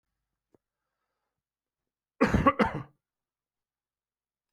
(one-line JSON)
{"cough_length": "4.5 s", "cough_amplitude": 12295, "cough_signal_mean_std_ratio": 0.23, "survey_phase": "beta (2021-08-13 to 2022-03-07)", "age": "45-64", "gender": "Male", "wearing_mask": "No", "symptom_diarrhoea": true, "symptom_fever_high_temperature": true, "symptom_headache": true, "symptom_onset": "3 days", "smoker_status": "Never smoked", "respiratory_condition_asthma": false, "respiratory_condition_other": false, "recruitment_source": "Test and Trace", "submission_delay": "1 day", "covid_test_result": "Positive", "covid_test_method": "RT-qPCR", "covid_ct_value": 18.9, "covid_ct_gene": "ORF1ab gene"}